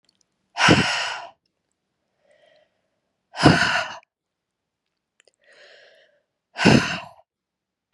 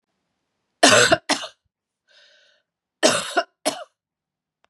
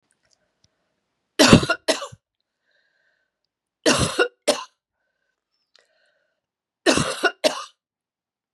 {"exhalation_length": "7.9 s", "exhalation_amplitude": 32660, "exhalation_signal_mean_std_ratio": 0.31, "cough_length": "4.7 s", "cough_amplitude": 31736, "cough_signal_mean_std_ratio": 0.31, "three_cough_length": "8.5 s", "three_cough_amplitude": 32768, "three_cough_signal_mean_std_ratio": 0.28, "survey_phase": "beta (2021-08-13 to 2022-03-07)", "age": "45-64", "gender": "Female", "wearing_mask": "No", "symptom_cough_any": true, "symptom_runny_or_blocked_nose": true, "symptom_sore_throat": true, "symptom_fatigue": true, "symptom_fever_high_temperature": true, "symptom_headache": true, "symptom_change_to_sense_of_smell_or_taste": true, "symptom_loss_of_taste": true, "symptom_onset": "3 days", "smoker_status": "Ex-smoker", "respiratory_condition_asthma": true, "respiratory_condition_other": false, "recruitment_source": "Test and Trace", "submission_delay": "2 days", "covid_test_result": "Positive", "covid_test_method": "ePCR"}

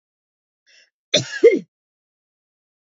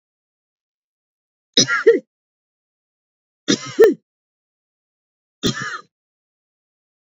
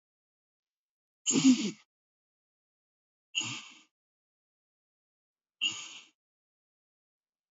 {"cough_length": "2.9 s", "cough_amplitude": 27337, "cough_signal_mean_std_ratio": 0.23, "three_cough_length": "7.1 s", "three_cough_amplitude": 31822, "three_cough_signal_mean_std_ratio": 0.25, "exhalation_length": "7.5 s", "exhalation_amplitude": 8134, "exhalation_signal_mean_std_ratio": 0.23, "survey_phase": "beta (2021-08-13 to 2022-03-07)", "age": "45-64", "gender": "Female", "wearing_mask": "No", "symptom_cough_any": true, "symptom_runny_or_blocked_nose": true, "symptom_headache": true, "smoker_status": "Never smoked", "respiratory_condition_asthma": false, "respiratory_condition_other": false, "recruitment_source": "Test and Trace", "submission_delay": "3 days", "covid_test_result": "Positive", "covid_test_method": "RT-qPCR", "covid_ct_value": 16.5, "covid_ct_gene": "ORF1ab gene", "covid_ct_mean": 16.6, "covid_viral_load": "3500000 copies/ml", "covid_viral_load_category": "High viral load (>1M copies/ml)"}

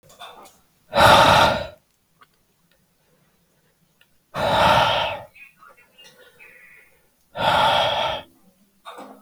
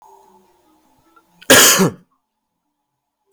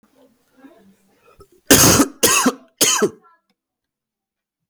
{"exhalation_length": "9.2 s", "exhalation_amplitude": 32197, "exhalation_signal_mean_std_ratio": 0.41, "cough_length": "3.3 s", "cough_amplitude": 32768, "cough_signal_mean_std_ratio": 0.3, "three_cough_length": "4.7 s", "three_cough_amplitude": 32768, "three_cough_signal_mean_std_ratio": 0.37, "survey_phase": "beta (2021-08-13 to 2022-03-07)", "age": "18-44", "gender": "Male", "wearing_mask": "No", "symptom_cough_any": true, "symptom_runny_or_blocked_nose": true, "symptom_abdominal_pain": true, "symptom_diarrhoea": true, "symptom_fatigue": true, "symptom_other": true, "smoker_status": "Never smoked", "respiratory_condition_asthma": false, "respiratory_condition_other": false, "recruitment_source": "Test and Trace", "submission_delay": "1 day", "covid_test_result": "Positive", "covid_test_method": "RT-qPCR", "covid_ct_value": 21.0, "covid_ct_gene": "N gene"}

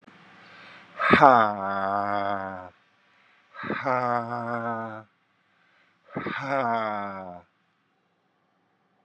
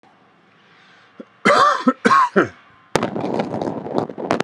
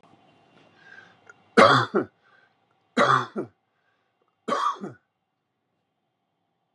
{"exhalation_length": "9.0 s", "exhalation_amplitude": 31109, "exhalation_signal_mean_std_ratio": 0.42, "cough_length": "4.4 s", "cough_amplitude": 32768, "cough_signal_mean_std_ratio": 0.5, "three_cough_length": "6.7 s", "three_cough_amplitude": 26361, "three_cough_signal_mean_std_ratio": 0.29, "survey_phase": "alpha (2021-03-01 to 2021-08-12)", "age": "45-64", "gender": "Male", "wearing_mask": "No", "symptom_none": true, "smoker_status": "Ex-smoker", "respiratory_condition_asthma": false, "respiratory_condition_other": false, "recruitment_source": "REACT", "submission_delay": "2 days", "covid_test_result": "Negative", "covid_test_method": "RT-qPCR"}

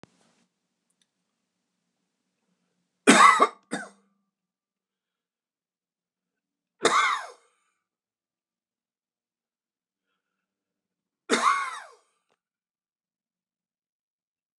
{"three_cough_length": "14.6 s", "three_cough_amplitude": 27046, "three_cough_signal_mean_std_ratio": 0.21, "survey_phase": "alpha (2021-03-01 to 2021-08-12)", "age": "65+", "gender": "Male", "wearing_mask": "No", "symptom_none": true, "smoker_status": "Ex-smoker", "respiratory_condition_asthma": false, "respiratory_condition_other": false, "recruitment_source": "REACT", "submission_delay": "5 days", "covid_test_result": "Negative", "covid_test_method": "RT-qPCR"}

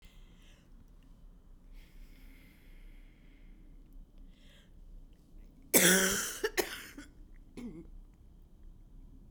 {"cough_length": "9.3 s", "cough_amplitude": 12767, "cough_signal_mean_std_ratio": 0.34, "survey_phase": "beta (2021-08-13 to 2022-03-07)", "age": "65+", "gender": "Female", "wearing_mask": "No", "symptom_new_continuous_cough": true, "symptom_runny_or_blocked_nose": true, "symptom_shortness_of_breath": true, "symptom_fatigue": true, "symptom_headache": true, "symptom_other": true, "symptom_onset": "3 days", "smoker_status": "Never smoked", "respiratory_condition_asthma": true, "respiratory_condition_other": false, "recruitment_source": "Test and Trace", "submission_delay": "2 days", "covid_test_result": "Positive", "covid_test_method": "ePCR"}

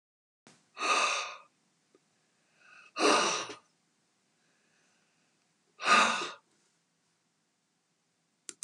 {"exhalation_length": "8.6 s", "exhalation_amplitude": 9823, "exhalation_signal_mean_std_ratio": 0.32, "survey_phase": "beta (2021-08-13 to 2022-03-07)", "age": "65+", "gender": "Female", "wearing_mask": "No", "symptom_none": true, "smoker_status": "Ex-smoker", "respiratory_condition_asthma": false, "respiratory_condition_other": false, "recruitment_source": "REACT", "submission_delay": "0 days", "covid_test_result": "Negative", "covid_test_method": "RT-qPCR", "influenza_a_test_result": "Negative", "influenza_b_test_result": "Negative"}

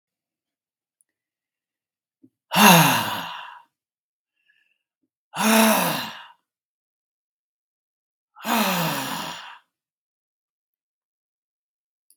{"exhalation_length": "12.2 s", "exhalation_amplitude": 32767, "exhalation_signal_mean_std_ratio": 0.31, "survey_phase": "beta (2021-08-13 to 2022-03-07)", "age": "65+", "gender": "Male", "wearing_mask": "No", "symptom_none": true, "smoker_status": "Ex-smoker", "respiratory_condition_asthma": false, "respiratory_condition_other": false, "recruitment_source": "REACT", "submission_delay": "1 day", "covid_test_result": "Negative", "covid_test_method": "RT-qPCR"}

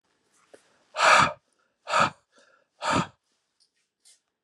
{"exhalation_length": "4.4 s", "exhalation_amplitude": 18743, "exhalation_signal_mean_std_ratio": 0.32, "survey_phase": "beta (2021-08-13 to 2022-03-07)", "age": "65+", "gender": "Male", "wearing_mask": "No", "symptom_none": true, "smoker_status": "Ex-smoker", "respiratory_condition_asthma": false, "respiratory_condition_other": false, "recruitment_source": "REACT", "submission_delay": "1 day", "covid_test_result": "Negative", "covid_test_method": "RT-qPCR", "influenza_a_test_result": "Negative", "influenza_b_test_result": "Negative"}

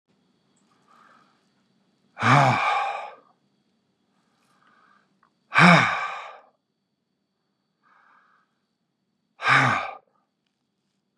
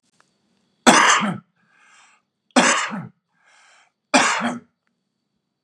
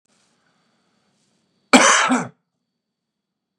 {"exhalation_length": "11.2 s", "exhalation_amplitude": 28981, "exhalation_signal_mean_std_ratio": 0.3, "three_cough_length": "5.6 s", "three_cough_amplitude": 32768, "three_cough_signal_mean_std_ratio": 0.36, "cough_length": "3.6 s", "cough_amplitude": 32768, "cough_signal_mean_std_ratio": 0.28, "survey_phase": "beta (2021-08-13 to 2022-03-07)", "age": "18-44", "gender": "Male", "wearing_mask": "Yes", "symptom_runny_or_blocked_nose": true, "symptom_shortness_of_breath": true, "symptom_headache": true, "symptom_onset": "4 days", "smoker_status": "Never smoked", "respiratory_condition_asthma": false, "respiratory_condition_other": false, "recruitment_source": "Test and Trace", "submission_delay": "2 days", "covid_test_result": "Positive", "covid_test_method": "RT-qPCR", "covid_ct_value": 18.3, "covid_ct_gene": "ORF1ab gene", "covid_ct_mean": 19.1, "covid_viral_load": "530000 copies/ml", "covid_viral_load_category": "Low viral load (10K-1M copies/ml)"}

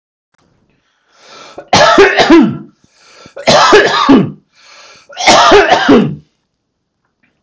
{"three_cough_length": "7.4 s", "three_cough_amplitude": 32768, "three_cough_signal_mean_std_ratio": 0.53, "survey_phase": "beta (2021-08-13 to 2022-03-07)", "age": "45-64", "gender": "Male", "wearing_mask": "No", "symptom_none": true, "smoker_status": "Ex-smoker", "respiratory_condition_asthma": false, "respiratory_condition_other": false, "recruitment_source": "REACT", "submission_delay": "1 day", "covid_test_result": "Negative", "covid_test_method": "RT-qPCR"}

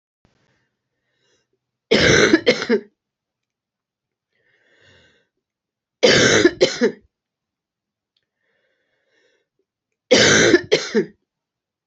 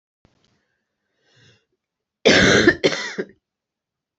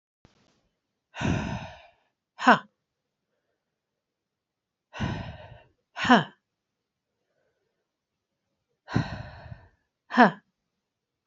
{"three_cough_length": "11.9 s", "three_cough_amplitude": 30232, "three_cough_signal_mean_std_ratio": 0.34, "cough_length": "4.2 s", "cough_amplitude": 27898, "cough_signal_mean_std_ratio": 0.32, "exhalation_length": "11.3 s", "exhalation_amplitude": 26492, "exhalation_signal_mean_std_ratio": 0.23, "survey_phase": "beta (2021-08-13 to 2022-03-07)", "age": "45-64", "gender": "Female", "wearing_mask": "No", "symptom_cough_any": true, "symptom_runny_or_blocked_nose": true, "symptom_headache": true, "symptom_onset": "3 days", "smoker_status": "Never smoked", "respiratory_condition_asthma": true, "respiratory_condition_other": false, "recruitment_source": "Test and Trace", "submission_delay": "2 days", "covid_test_result": "Positive", "covid_test_method": "RT-qPCR", "covid_ct_value": 22.7, "covid_ct_gene": "ORF1ab gene"}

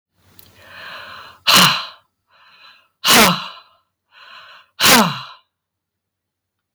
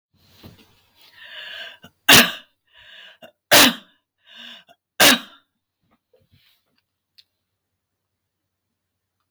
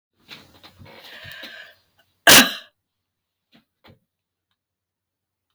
{"exhalation_length": "6.7 s", "exhalation_amplitude": 32768, "exhalation_signal_mean_std_ratio": 0.35, "three_cough_length": "9.3 s", "three_cough_amplitude": 32768, "three_cough_signal_mean_std_ratio": 0.22, "cough_length": "5.5 s", "cough_amplitude": 32768, "cough_signal_mean_std_ratio": 0.18, "survey_phase": "beta (2021-08-13 to 2022-03-07)", "age": "65+", "gender": "Female", "wearing_mask": "No", "symptom_none": true, "smoker_status": "Never smoked", "respiratory_condition_asthma": false, "respiratory_condition_other": false, "recruitment_source": "REACT", "submission_delay": "1 day", "covid_test_result": "Negative", "covid_test_method": "RT-qPCR", "influenza_a_test_result": "Negative", "influenza_b_test_result": "Negative"}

